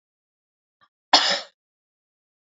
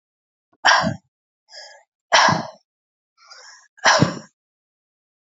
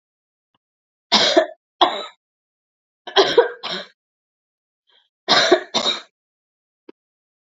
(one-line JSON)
{"cough_length": "2.6 s", "cough_amplitude": 27069, "cough_signal_mean_std_ratio": 0.22, "exhalation_length": "5.2 s", "exhalation_amplitude": 29259, "exhalation_signal_mean_std_ratio": 0.33, "three_cough_length": "7.4 s", "three_cough_amplitude": 30474, "three_cough_signal_mean_std_ratio": 0.33, "survey_phase": "beta (2021-08-13 to 2022-03-07)", "age": "45-64", "gender": "Female", "wearing_mask": "No", "symptom_runny_or_blocked_nose": true, "symptom_shortness_of_breath": true, "symptom_sore_throat": true, "symptom_fatigue": true, "symptom_fever_high_temperature": true, "symptom_headache": true, "symptom_change_to_sense_of_smell_or_taste": true, "symptom_loss_of_taste": true, "symptom_onset": "2 days", "smoker_status": "Never smoked", "respiratory_condition_asthma": true, "respiratory_condition_other": false, "recruitment_source": "Test and Trace", "submission_delay": "1 day", "covid_test_result": "Positive", "covid_test_method": "RT-qPCR", "covid_ct_value": 26.9, "covid_ct_gene": "N gene"}